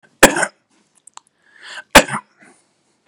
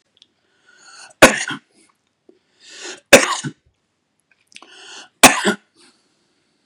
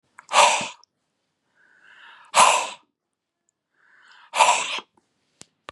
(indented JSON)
{
  "cough_length": "3.1 s",
  "cough_amplitude": 32768,
  "cough_signal_mean_std_ratio": 0.23,
  "three_cough_length": "6.7 s",
  "three_cough_amplitude": 32768,
  "three_cough_signal_mean_std_ratio": 0.23,
  "exhalation_length": "5.7 s",
  "exhalation_amplitude": 29894,
  "exhalation_signal_mean_std_ratio": 0.33,
  "survey_phase": "beta (2021-08-13 to 2022-03-07)",
  "age": "45-64",
  "gender": "Male",
  "wearing_mask": "No",
  "symptom_none": true,
  "smoker_status": "Ex-smoker",
  "respiratory_condition_asthma": false,
  "respiratory_condition_other": false,
  "recruitment_source": "REACT",
  "submission_delay": "3 days",
  "covid_test_result": "Negative",
  "covid_test_method": "RT-qPCR",
  "influenza_a_test_result": "Negative",
  "influenza_b_test_result": "Negative"
}